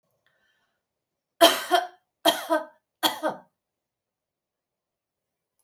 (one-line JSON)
{"three_cough_length": "5.6 s", "three_cough_amplitude": 27190, "three_cough_signal_mean_std_ratio": 0.27, "survey_phase": "beta (2021-08-13 to 2022-03-07)", "age": "45-64", "gender": "Female", "wearing_mask": "No", "symptom_none": true, "smoker_status": "Never smoked", "respiratory_condition_asthma": false, "respiratory_condition_other": false, "recruitment_source": "REACT", "submission_delay": "6 days", "covid_test_result": "Negative", "covid_test_method": "RT-qPCR"}